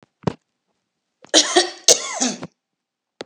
{
  "cough_length": "3.3 s",
  "cough_amplitude": 32768,
  "cough_signal_mean_std_ratio": 0.33,
  "survey_phase": "beta (2021-08-13 to 2022-03-07)",
  "age": "65+",
  "gender": "Female",
  "wearing_mask": "No",
  "symptom_none": true,
  "smoker_status": "Ex-smoker",
  "respiratory_condition_asthma": false,
  "respiratory_condition_other": false,
  "recruitment_source": "REACT",
  "submission_delay": "3 days",
  "covid_test_result": "Negative",
  "covid_test_method": "RT-qPCR",
  "influenza_a_test_result": "Negative",
  "influenza_b_test_result": "Negative"
}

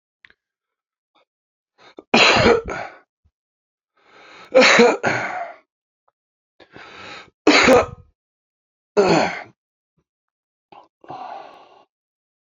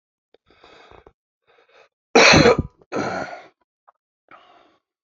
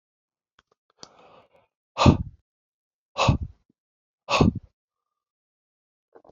{
  "three_cough_length": "12.5 s",
  "three_cough_amplitude": 30791,
  "three_cough_signal_mean_std_ratio": 0.34,
  "cough_length": "5.0 s",
  "cough_amplitude": 30450,
  "cough_signal_mean_std_ratio": 0.29,
  "exhalation_length": "6.3 s",
  "exhalation_amplitude": 25114,
  "exhalation_signal_mean_std_ratio": 0.24,
  "survey_phase": "beta (2021-08-13 to 2022-03-07)",
  "age": "45-64",
  "gender": "Male",
  "wearing_mask": "No",
  "symptom_cough_any": true,
  "symptom_sore_throat": true,
  "symptom_fatigue": true,
  "symptom_onset": "4 days",
  "smoker_status": "Ex-smoker",
  "respiratory_condition_asthma": false,
  "respiratory_condition_other": true,
  "recruitment_source": "Test and Trace",
  "submission_delay": "2 days",
  "covid_test_result": "Positive",
  "covid_test_method": "ePCR"
}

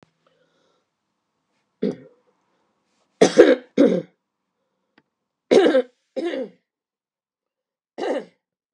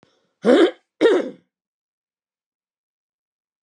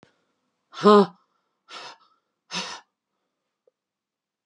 {
  "three_cough_length": "8.7 s",
  "three_cough_amplitude": 32768,
  "three_cough_signal_mean_std_ratio": 0.28,
  "cough_length": "3.6 s",
  "cough_amplitude": 25864,
  "cough_signal_mean_std_ratio": 0.31,
  "exhalation_length": "4.5 s",
  "exhalation_amplitude": 26196,
  "exhalation_signal_mean_std_ratio": 0.2,
  "survey_phase": "beta (2021-08-13 to 2022-03-07)",
  "age": "65+",
  "gender": "Female",
  "wearing_mask": "No",
  "symptom_none": true,
  "smoker_status": "Never smoked",
  "respiratory_condition_asthma": true,
  "respiratory_condition_other": false,
  "recruitment_source": "REACT",
  "submission_delay": "1 day",
  "covid_test_result": "Negative",
  "covid_test_method": "RT-qPCR",
  "influenza_a_test_result": "Negative",
  "influenza_b_test_result": "Negative"
}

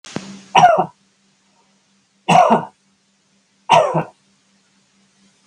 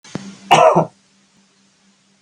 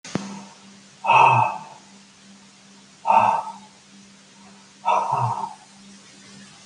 {
  "three_cough_length": "5.5 s",
  "three_cough_amplitude": 32768,
  "three_cough_signal_mean_std_ratio": 0.34,
  "cough_length": "2.2 s",
  "cough_amplitude": 32766,
  "cough_signal_mean_std_ratio": 0.34,
  "exhalation_length": "6.7 s",
  "exhalation_amplitude": 23419,
  "exhalation_signal_mean_std_ratio": 0.43,
  "survey_phase": "beta (2021-08-13 to 2022-03-07)",
  "age": "65+",
  "gender": "Male",
  "wearing_mask": "No",
  "symptom_none": true,
  "smoker_status": "Never smoked",
  "respiratory_condition_asthma": false,
  "respiratory_condition_other": false,
  "recruitment_source": "REACT",
  "submission_delay": "2 days",
  "covid_test_result": "Negative",
  "covid_test_method": "RT-qPCR",
  "influenza_a_test_result": "Negative",
  "influenza_b_test_result": "Negative"
}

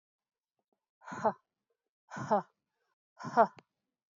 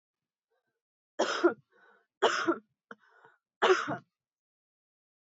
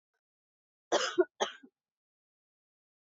{
  "exhalation_length": "4.2 s",
  "exhalation_amplitude": 8336,
  "exhalation_signal_mean_std_ratio": 0.25,
  "three_cough_length": "5.2 s",
  "three_cough_amplitude": 9146,
  "three_cough_signal_mean_std_ratio": 0.32,
  "cough_length": "3.2 s",
  "cough_amplitude": 6401,
  "cough_signal_mean_std_ratio": 0.24,
  "survey_phase": "beta (2021-08-13 to 2022-03-07)",
  "age": "45-64",
  "gender": "Female",
  "wearing_mask": "No",
  "symptom_cough_any": true,
  "symptom_runny_or_blocked_nose": true,
  "symptom_fatigue": true,
  "symptom_onset": "5 days",
  "smoker_status": "Ex-smoker",
  "respiratory_condition_asthma": false,
  "respiratory_condition_other": false,
  "recruitment_source": "Test and Trace",
  "submission_delay": "1 day",
  "covid_test_result": "Positive",
  "covid_test_method": "RT-qPCR",
  "covid_ct_value": 24.1,
  "covid_ct_gene": "N gene"
}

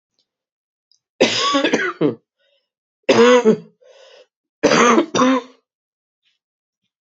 {
  "three_cough_length": "7.1 s",
  "three_cough_amplitude": 28375,
  "three_cough_signal_mean_std_ratio": 0.42,
  "survey_phase": "beta (2021-08-13 to 2022-03-07)",
  "age": "45-64",
  "gender": "Female",
  "wearing_mask": "No",
  "symptom_cough_any": true,
  "symptom_runny_or_blocked_nose": true,
  "symptom_fatigue": true,
  "symptom_headache": true,
  "symptom_onset": "4 days",
  "smoker_status": "Never smoked",
  "respiratory_condition_asthma": false,
  "respiratory_condition_other": false,
  "recruitment_source": "Test and Trace",
  "submission_delay": "1 day",
  "covid_test_result": "Positive",
  "covid_test_method": "ePCR"
}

